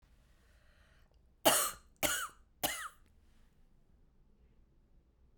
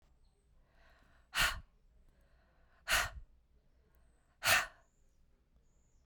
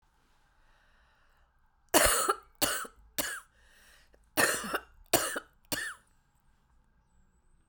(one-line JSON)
{"three_cough_length": "5.4 s", "three_cough_amplitude": 8683, "three_cough_signal_mean_std_ratio": 0.29, "exhalation_length": "6.1 s", "exhalation_amplitude": 5849, "exhalation_signal_mean_std_ratio": 0.28, "cough_length": "7.7 s", "cough_amplitude": 14072, "cough_signal_mean_std_ratio": 0.34, "survey_phase": "beta (2021-08-13 to 2022-03-07)", "age": "45-64", "gender": "Female", "wearing_mask": "No", "symptom_cough_any": true, "symptom_runny_or_blocked_nose": true, "symptom_sore_throat": true, "symptom_onset": "7 days", "smoker_status": "Never smoked", "respiratory_condition_asthma": false, "respiratory_condition_other": false, "recruitment_source": "REACT", "submission_delay": "2 days", "covid_test_result": "Negative", "covid_test_method": "RT-qPCR"}